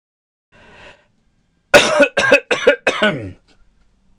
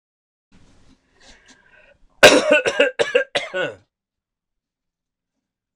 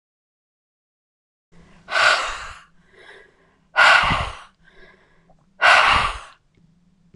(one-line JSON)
{"cough_length": "4.2 s", "cough_amplitude": 26028, "cough_signal_mean_std_ratio": 0.39, "three_cough_length": "5.8 s", "three_cough_amplitude": 26028, "three_cough_signal_mean_std_ratio": 0.3, "exhalation_length": "7.2 s", "exhalation_amplitude": 26028, "exhalation_signal_mean_std_ratio": 0.37, "survey_phase": "beta (2021-08-13 to 2022-03-07)", "age": "18-44", "gender": "Male", "wearing_mask": "No", "symptom_none": true, "smoker_status": "Never smoked", "respiratory_condition_asthma": false, "respiratory_condition_other": false, "recruitment_source": "REACT", "submission_delay": "1 day", "covid_test_result": "Negative", "covid_test_method": "RT-qPCR", "influenza_a_test_result": "Unknown/Void", "influenza_b_test_result": "Unknown/Void"}